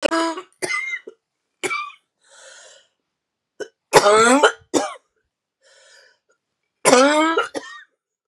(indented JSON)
{
  "three_cough_length": "8.3 s",
  "three_cough_amplitude": 32768,
  "three_cough_signal_mean_std_ratio": 0.4,
  "survey_phase": "beta (2021-08-13 to 2022-03-07)",
  "age": "45-64",
  "gender": "Female",
  "wearing_mask": "No",
  "symptom_cough_any": true,
  "symptom_new_continuous_cough": true,
  "symptom_runny_or_blocked_nose": true,
  "symptom_shortness_of_breath": true,
  "symptom_fatigue": true,
  "symptom_fever_high_temperature": true,
  "symptom_headache": true,
  "symptom_change_to_sense_of_smell_or_taste": true,
  "symptom_loss_of_taste": true,
  "symptom_onset": "4 days",
  "smoker_status": "Never smoked",
  "respiratory_condition_asthma": false,
  "respiratory_condition_other": false,
  "recruitment_source": "Test and Trace",
  "submission_delay": "1 day",
  "covid_test_result": "Positive",
  "covid_test_method": "ePCR"
}